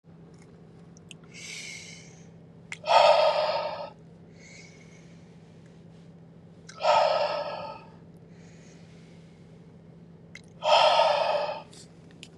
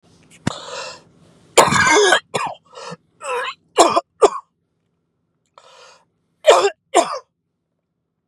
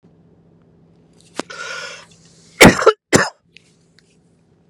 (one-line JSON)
{"exhalation_length": "12.4 s", "exhalation_amplitude": 17527, "exhalation_signal_mean_std_ratio": 0.43, "three_cough_length": "8.3 s", "three_cough_amplitude": 32768, "three_cough_signal_mean_std_ratio": 0.36, "cough_length": "4.7 s", "cough_amplitude": 32768, "cough_signal_mean_std_ratio": 0.25, "survey_phase": "beta (2021-08-13 to 2022-03-07)", "age": "18-44", "gender": "Male", "wearing_mask": "No", "symptom_cough_any": true, "symptom_runny_or_blocked_nose": true, "symptom_shortness_of_breath": true, "symptom_sore_throat": true, "symptom_abdominal_pain": true, "symptom_diarrhoea": true, "symptom_fatigue": true, "symptom_fever_high_temperature": true, "symptom_headache": true, "symptom_change_to_sense_of_smell_or_taste": true, "symptom_other": true, "symptom_onset": "1 day", "smoker_status": "Never smoked", "respiratory_condition_asthma": false, "respiratory_condition_other": false, "recruitment_source": "Test and Trace", "submission_delay": "-1 day", "covid_test_result": "Negative", "covid_test_method": "ePCR"}